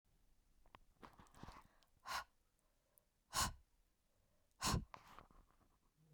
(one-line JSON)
{"exhalation_length": "6.1 s", "exhalation_amplitude": 1771, "exhalation_signal_mean_std_ratio": 0.3, "survey_phase": "beta (2021-08-13 to 2022-03-07)", "age": "45-64", "gender": "Female", "wearing_mask": "No", "symptom_cough_any": true, "symptom_runny_or_blocked_nose": true, "symptom_shortness_of_breath": true, "symptom_sore_throat": true, "symptom_fatigue": true, "symptom_headache": true, "symptom_onset": "2 days", "smoker_status": "Ex-smoker", "respiratory_condition_asthma": false, "respiratory_condition_other": false, "recruitment_source": "Test and Trace", "submission_delay": "1 day", "covid_test_result": "Positive", "covid_test_method": "RT-qPCR"}